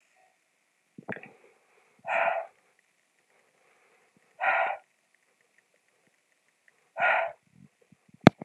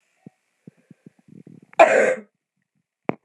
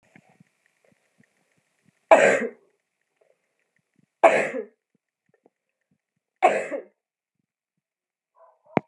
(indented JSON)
{
  "exhalation_length": "8.4 s",
  "exhalation_amplitude": 32768,
  "exhalation_signal_mean_std_ratio": 0.23,
  "cough_length": "3.2 s",
  "cough_amplitude": 32754,
  "cough_signal_mean_std_ratio": 0.26,
  "three_cough_length": "8.9 s",
  "three_cough_amplitude": 31785,
  "three_cough_signal_mean_std_ratio": 0.23,
  "survey_phase": "beta (2021-08-13 to 2022-03-07)",
  "age": "45-64",
  "gender": "Female",
  "wearing_mask": "No",
  "symptom_cough_any": true,
  "symptom_runny_or_blocked_nose": true,
  "smoker_status": "Never smoked",
  "respiratory_condition_asthma": false,
  "respiratory_condition_other": false,
  "recruitment_source": "Test and Trace",
  "submission_delay": "2 days",
  "covid_test_result": "Positive",
  "covid_test_method": "RT-qPCR",
  "covid_ct_value": 20.8,
  "covid_ct_gene": "ORF1ab gene",
  "covid_ct_mean": 21.4,
  "covid_viral_load": "96000 copies/ml",
  "covid_viral_load_category": "Low viral load (10K-1M copies/ml)"
}